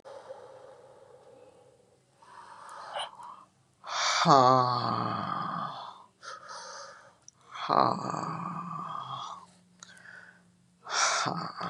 {"exhalation_length": "11.7 s", "exhalation_amplitude": 16913, "exhalation_signal_mean_std_ratio": 0.45, "survey_phase": "beta (2021-08-13 to 2022-03-07)", "age": "65+", "gender": "Female", "wearing_mask": "No", "symptom_none": true, "smoker_status": "Never smoked", "respiratory_condition_asthma": false, "respiratory_condition_other": false, "recruitment_source": "REACT", "submission_delay": "2 days", "covid_test_result": "Negative", "covid_test_method": "RT-qPCR", "influenza_a_test_result": "Negative", "influenza_b_test_result": "Negative"}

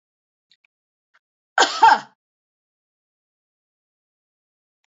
{"cough_length": "4.9 s", "cough_amplitude": 25941, "cough_signal_mean_std_ratio": 0.19, "survey_phase": "beta (2021-08-13 to 2022-03-07)", "age": "65+", "gender": "Female", "wearing_mask": "No", "symptom_headache": true, "smoker_status": "Never smoked", "respiratory_condition_asthma": false, "respiratory_condition_other": false, "recruitment_source": "REACT", "submission_delay": "1 day", "covid_test_result": "Negative", "covid_test_method": "RT-qPCR", "influenza_a_test_result": "Negative", "influenza_b_test_result": "Negative"}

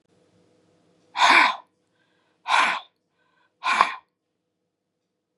{"exhalation_length": "5.4 s", "exhalation_amplitude": 32721, "exhalation_signal_mean_std_ratio": 0.32, "survey_phase": "beta (2021-08-13 to 2022-03-07)", "age": "65+", "gender": "Female", "wearing_mask": "No", "symptom_none": true, "smoker_status": "Never smoked", "respiratory_condition_asthma": false, "respiratory_condition_other": false, "recruitment_source": "REACT", "submission_delay": "0 days", "covid_test_result": "Negative", "covid_test_method": "RT-qPCR"}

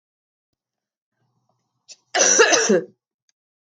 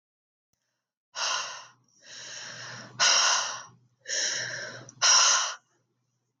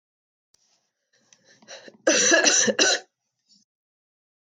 {"cough_length": "3.8 s", "cough_amplitude": 25723, "cough_signal_mean_std_ratio": 0.34, "exhalation_length": "6.4 s", "exhalation_amplitude": 12506, "exhalation_signal_mean_std_ratio": 0.46, "three_cough_length": "4.4 s", "three_cough_amplitude": 21759, "three_cough_signal_mean_std_ratio": 0.37, "survey_phase": "beta (2021-08-13 to 2022-03-07)", "age": "18-44", "gender": "Female", "wearing_mask": "No", "symptom_cough_any": true, "symptom_runny_or_blocked_nose": true, "symptom_sore_throat": true, "symptom_fatigue": true, "symptom_headache": true, "symptom_change_to_sense_of_smell_or_taste": true, "symptom_loss_of_taste": true, "symptom_other": true, "symptom_onset": "4 days", "smoker_status": "Never smoked", "respiratory_condition_asthma": false, "respiratory_condition_other": false, "recruitment_source": "Test and Trace", "submission_delay": "1 day", "covid_test_result": "Positive", "covid_test_method": "RT-qPCR", "covid_ct_value": 20.2, "covid_ct_gene": "ORF1ab gene", "covid_ct_mean": 20.7, "covid_viral_load": "160000 copies/ml", "covid_viral_load_category": "Low viral load (10K-1M copies/ml)"}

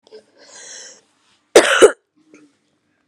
{"cough_length": "3.1 s", "cough_amplitude": 32768, "cough_signal_mean_std_ratio": 0.26, "survey_phase": "beta (2021-08-13 to 2022-03-07)", "age": "18-44", "gender": "Female", "wearing_mask": "No", "symptom_cough_any": true, "symptom_runny_or_blocked_nose": true, "symptom_diarrhoea": true, "symptom_fatigue": true, "symptom_change_to_sense_of_smell_or_taste": true, "symptom_onset": "4 days", "smoker_status": "Never smoked", "respiratory_condition_asthma": false, "respiratory_condition_other": false, "recruitment_source": "Test and Trace", "submission_delay": "2 days", "covid_test_result": "Positive", "covid_test_method": "RT-qPCR", "covid_ct_value": 17.3, "covid_ct_gene": "ORF1ab gene", "covid_ct_mean": 17.6, "covid_viral_load": "1600000 copies/ml", "covid_viral_load_category": "High viral load (>1M copies/ml)"}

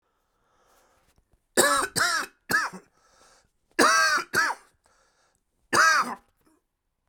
{"three_cough_length": "7.1 s", "three_cough_amplitude": 20638, "three_cough_signal_mean_std_ratio": 0.42, "survey_phase": "beta (2021-08-13 to 2022-03-07)", "age": "45-64", "gender": "Male", "wearing_mask": "No", "symptom_cough_any": true, "symptom_runny_or_blocked_nose": true, "symptom_abdominal_pain": true, "symptom_fatigue": true, "symptom_headache": true, "symptom_change_to_sense_of_smell_or_taste": true, "symptom_loss_of_taste": true, "symptom_onset": "4 days", "smoker_status": "Ex-smoker", "respiratory_condition_asthma": false, "respiratory_condition_other": true, "recruitment_source": "Test and Trace", "submission_delay": "1 day", "covid_test_result": "Positive", "covid_test_method": "RT-qPCR", "covid_ct_value": 14.8, "covid_ct_gene": "ORF1ab gene", "covid_ct_mean": 15.3, "covid_viral_load": "9700000 copies/ml", "covid_viral_load_category": "High viral load (>1M copies/ml)"}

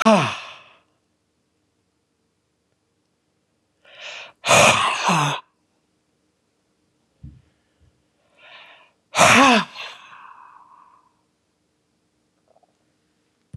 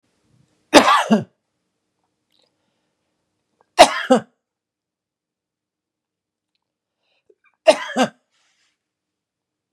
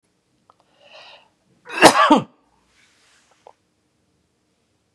{"exhalation_length": "13.6 s", "exhalation_amplitude": 32254, "exhalation_signal_mean_std_ratio": 0.29, "three_cough_length": "9.7 s", "three_cough_amplitude": 32768, "three_cough_signal_mean_std_ratio": 0.22, "cough_length": "4.9 s", "cough_amplitude": 32768, "cough_signal_mean_std_ratio": 0.22, "survey_phase": "beta (2021-08-13 to 2022-03-07)", "age": "65+", "gender": "Male", "wearing_mask": "No", "symptom_none": true, "smoker_status": "Ex-smoker", "respiratory_condition_asthma": false, "respiratory_condition_other": false, "recruitment_source": "REACT", "submission_delay": "2 days", "covid_test_result": "Negative", "covid_test_method": "RT-qPCR", "influenza_a_test_result": "Negative", "influenza_b_test_result": "Negative"}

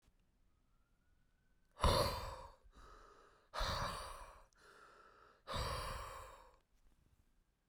{"exhalation_length": "7.7 s", "exhalation_amplitude": 3230, "exhalation_signal_mean_std_ratio": 0.4, "survey_phase": "beta (2021-08-13 to 2022-03-07)", "age": "45-64", "gender": "Male", "wearing_mask": "No", "symptom_cough_any": true, "symptom_shortness_of_breath": true, "symptom_fatigue": true, "symptom_fever_high_temperature": true, "symptom_headache": true, "symptom_change_to_sense_of_smell_or_taste": true, "symptom_onset": "3 days", "smoker_status": "Never smoked", "respiratory_condition_asthma": true, "respiratory_condition_other": false, "recruitment_source": "Test and Trace", "submission_delay": "1 day", "covid_test_result": "Positive", "covid_test_method": "RT-qPCR", "covid_ct_value": 18.0, "covid_ct_gene": "ORF1ab gene"}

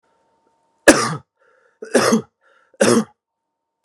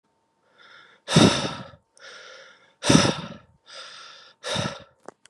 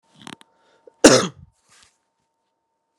{"three_cough_length": "3.8 s", "three_cough_amplitude": 32768, "three_cough_signal_mean_std_ratio": 0.33, "exhalation_length": "5.3 s", "exhalation_amplitude": 27687, "exhalation_signal_mean_std_ratio": 0.34, "cough_length": "3.0 s", "cough_amplitude": 32768, "cough_signal_mean_std_ratio": 0.2, "survey_phase": "beta (2021-08-13 to 2022-03-07)", "age": "18-44", "gender": "Male", "wearing_mask": "No", "symptom_none": true, "smoker_status": "Never smoked", "respiratory_condition_asthma": false, "respiratory_condition_other": false, "recruitment_source": "Test and Trace", "submission_delay": "-27 days", "covid_test_result": "Negative", "covid_test_method": "LFT"}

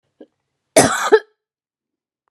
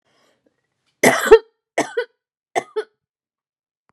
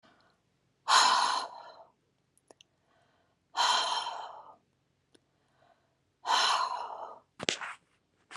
{"cough_length": "2.3 s", "cough_amplitude": 32768, "cough_signal_mean_std_ratio": 0.29, "three_cough_length": "3.9 s", "three_cough_amplitude": 32768, "three_cough_signal_mean_std_ratio": 0.25, "exhalation_length": "8.4 s", "exhalation_amplitude": 17687, "exhalation_signal_mean_std_ratio": 0.4, "survey_phase": "beta (2021-08-13 to 2022-03-07)", "age": "18-44", "gender": "Female", "wearing_mask": "No", "symptom_none": true, "smoker_status": "Never smoked", "respiratory_condition_asthma": false, "respiratory_condition_other": false, "recruitment_source": "REACT", "submission_delay": "6 days", "covid_test_result": "Negative", "covid_test_method": "RT-qPCR"}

